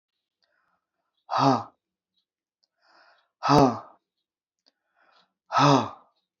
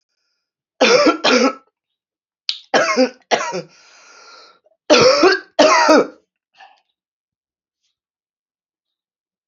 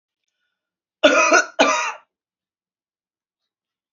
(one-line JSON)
{"exhalation_length": "6.4 s", "exhalation_amplitude": 16007, "exhalation_signal_mean_std_ratio": 0.29, "three_cough_length": "9.5 s", "three_cough_amplitude": 32768, "three_cough_signal_mean_std_ratio": 0.4, "cough_length": "3.9 s", "cough_amplitude": 32767, "cough_signal_mean_std_ratio": 0.33, "survey_phase": "beta (2021-08-13 to 2022-03-07)", "age": "45-64", "gender": "Female", "wearing_mask": "No", "symptom_cough_any": true, "symptom_runny_or_blocked_nose": true, "symptom_sore_throat": true, "symptom_fatigue": true, "symptom_headache": true, "symptom_onset": "2 days", "smoker_status": "Never smoked", "respiratory_condition_asthma": false, "respiratory_condition_other": false, "recruitment_source": "Test and Trace", "submission_delay": "1 day", "covid_test_result": "Negative", "covid_test_method": "RT-qPCR"}